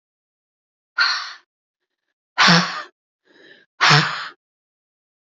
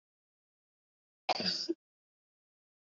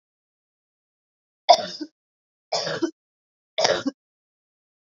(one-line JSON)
{"exhalation_length": "5.4 s", "exhalation_amplitude": 32007, "exhalation_signal_mean_std_ratio": 0.33, "cough_length": "2.8 s", "cough_amplitude": 4619, "cough_signal_mean_std_ratio": 0.28, "three_cough_length": "4.9 s", "three_cough_amplitude": 28685, "three_cough_signal_mean_std_ratio": 0.26, "survey_phase": "beta (2021-08-13 to 2022-03-07)", "age": "18-44", "gender": "Female", "wearing_mask": "No", "symptom_none": true, "smoker_status": "Never smoked", "respiratory_condition_asthma": false, "respiratory_condition_other": false, "recruitment_source": "REACT", "submission_delay": "4 days", "covid_test_result": "Negative", "covid_test_method": "RT-qPCR", "influenza_a_test_result": "Negative", "influenza_b_test_result": "Negative"}